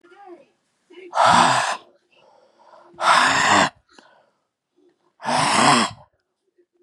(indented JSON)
{
  "exhalation_length": "6.8 s",
  "exhalation_amplitude": 27228,
  "exhalation_signal_mean_std_ratio": 0.45,
  "survey_phase": "beta (2021-08-13 to 2022-03-07)",
  "age": "18-44",
  "gender": "Male",
  "wearing_mask": "No",
  "symptom_none": true,
  "smoker_status": "Ex-smoker",
  "respiratory_condition_asthma": true,
  "respiratory_condition_other": false,
  "recruitment_source": "REACT",
  "submission_delay": "1 day",
  "covid_test_result": "Negative",
  "covid_test_method": "RT-qPCR"
}